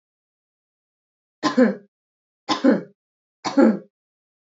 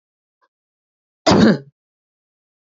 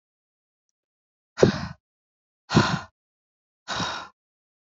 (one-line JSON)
{"three_cough_length": "4.4 s", "three_cough_amplitude": 22191, "three_cough_signal_mean_std_ratio": 0.32, "cough_length": "2.6 s", "cough_amplitude": 29539, "cough_signal_mean_std_ratio": 0.28, "exhalation_length": "4.7 s", "exhalation_amplitude": 27334, "exhalation_signal_mean_std_ratio": 0.27, "survey_phase": "beta (2021-08-13 to 2022-03-07)", "age": "18-44", "gender": "Female", "wearing_mask": "No", "symptom_cough_any": true, "symptom_sore_throat": true, "symptom_onset": "12 days", "smoker_status": "Never smoked", "respiratory_condition_asthma": false, "respiratory_condition_other": false, "recruitment_source": "REACT", "submission_delay": "1 day", "covid_test_result": "Negative", "covid_test_method": "RT-qPCR"}